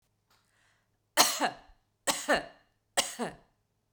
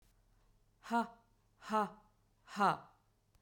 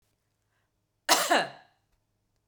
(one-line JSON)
{"three_cough_length": "3.9 s", "three_cough_amplitude": 16112, "three_cough_signal_mean_std_ratio": 0.33, "exhalation_length": "3.4 s", "exhalation_amplitude": 3876, "exhalation_signal_mean_std_ratio": 0.33, "cough_length": "2.5 s", "cough_amplitude": 14825, "cough_signal_mean_std_ratio": 0.29, "survey_phase": "beta (2021-08-13 to 2022-03-07)", "age": "45-64", "gender": "Female", "wearing_mask": "No", "symptom_none": true, "symptom_onset": "8 days", "smoker_status": "Never smoked", "respiratory_condition_asthma": false, "respiratory_condition_other": false, "recruitment_source": "REACT", "submission_delay": "3 days", "covid_test_result": "Negative", "covid_test_method": "RT-qPCR", "influenza_a_test_result": "Negative", "influenza_b_test_result": "Negative"}